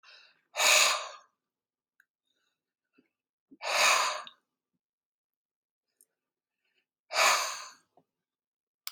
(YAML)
exhalation_length: 8.9 s
exhalation_amplitude: 10969
exhalation_signal_mean_std_ratio: 0.32
survey_phase: beta (2021-08-13 to 2022-03-07)
age: 45-64
gender: Male
wearing_mask: 'No'
symptom_none: true
smoker_status: Ex-smoker
respiratory_condition_asthma: false
respiratory_condition_other: false
recruitment_source: REACT
submission_delay: 1 day
covid_test_result: Negative
covid_test_method: RT-qPCR